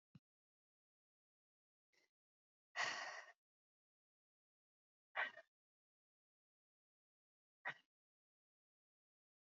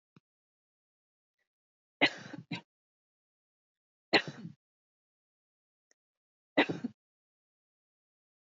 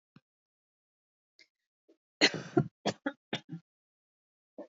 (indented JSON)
{
  "exhalation_length": "9.6 s",
  "exhalation_amplitude": 1022,
  "exhalation_signal_mean_std_ratio": 0.2,
  "three_cough_length": "8.4 s",
  "three_cough_amplitude": 9024,
  "three_cough_signal_mean_std_ratio": 0.17,
  "cough_length": "4.8 s",
  "cough_amplitude": 10725,
  "cough_signal_mean_std_ratio": 0.22,
  "survey_phase": "beta (2021-08-13 to 2022-03-07)",
  "age": "45-64",
  "gender": "Female",
  "wearing_mask": "No",
  "symptom_headache": true,
  "symptom_onset": "12 days",
  "smoker_status": "Ex-smoker",
  "respiratory_condition_asthma": false,
  "respiratory_condition_other": false,
  "recruitment_source": "REACT",
  "submission_delay": "2 days",
  "covid_test_result": "Negative",
  "covid_test_method": "RT-qPCR",
  "influenza_a_test_result": "Negative",
  "influenza_b_test_result": "Negative"
}